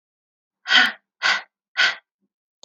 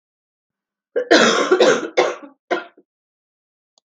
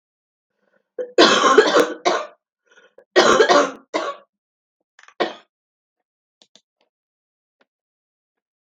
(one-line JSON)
{"exhalation_length": "2.6 s", "exhalation_amplitude": 24242, "exhalation_signal_mean_std_ratio": 0.36, "cough_length": "3.8 s", "cough_amplitude": 32768, "cough_signal_mean_std_ratio": 0.42, "three_cough_length": "8.6 s", "three_cough_amplitude": 32768, "three_cough_signal_mean_std_ratio": 0.34, "survey_phase": "beta (2021-08-13 to 2022-03-07)", "age": "18-44", "gender": "Female", "wearing_mask": "No", "symptom_cough_any": true, "symptom_runny_or_blocked_nose": true, "symptom_sore_throat": true, "symptom_fatigue": true, "symptom_fever_high_temperature": true, "symptom_headache": true, "symptom_change_to_sense_of_smell_or_taste": true, "symptom_loss_of_taste": true, "symptom_onset": "3 days", "smoker_status": "Never smoked", "respiratory_condition_asthma": false, "respiratory_condition_other": false, "recruitment_source": "Test and Trace", "submission_delay": "2 days", "covid_test_result": "Positive", "covid_test_method": "RT-qPCR", "covid_ct_value": 16.2, "covid_ct_gene": "ORF1ab gene", "covid_ct_mean": 16.6, "covid_viral_load": "3600000 copies/ml", "covid_viral_load_category": "High viral load (>1M copies/ml)"}